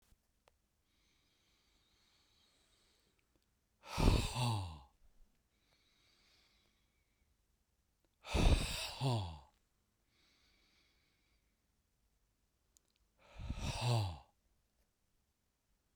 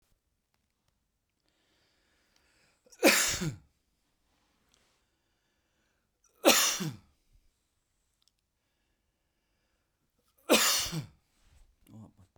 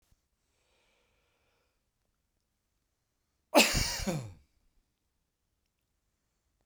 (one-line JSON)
{"exhalation_length": "16.0 s", "exhalation_amplitude": 4987, "exhalation_signal_mean_std_ratio": 0.3, "three_cough_length": "12.4 s", "three_cough_amplitude": 16224, "three_cough_signal_mean_std_ratio": 0.25, "cough_length": "6.7 s", "cough_amplitude": 13689, "cough_signal_mean_std_ratio": 0.21, "survey_phase": "beta (2021-08-13 to 2022-03-07)", "age": "45-64", "gender": "Male", "wearing_mask": "No", "symptom_none": true, "smoker_status": "Never smoked", "respiratory_condition_asthma": false, "respiratory_condition_other": false, "recruitment_source": "REACT", "submission_delay": "2 days", "covid_test_result": "Negative", "covid_test_method": "RT-qPCR", "influenza_a_test_result": "Unknown/Void", "influenza_b_test_result": "Unknown/Void"}